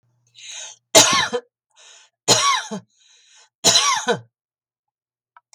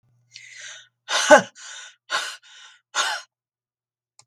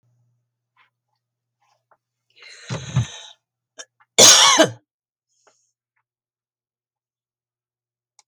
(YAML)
three_cough_length: 5.5 s
three_cough_amplitude: 32768
three_cough_signal_mean_std_ratio: 0.38
exhalation_length: 4.3 s
exhalation_amplitude: 32768
exhalation_signal_mean_std_ratio: 0.27
cough_length: 8.3 s
cough_amplitude: 32768
cough_signal_mean_std_ratio: 0.22
survey_phase: beta (2021-08-13 to 2022-03-07)
age: 65+
gender: Female
wearing_mask: 'No'
symptom_none: true
smoker_status: Never smoked
respiratory_condition_asthma: false
respiratory_condition_other: false
recruitment_source: REACT
submission_delay: 1 day
covid_test_result: Negative
covid_test_method: RT-qPCR
influenza_a_test_result: Negative
influenza_b_test_result: Negative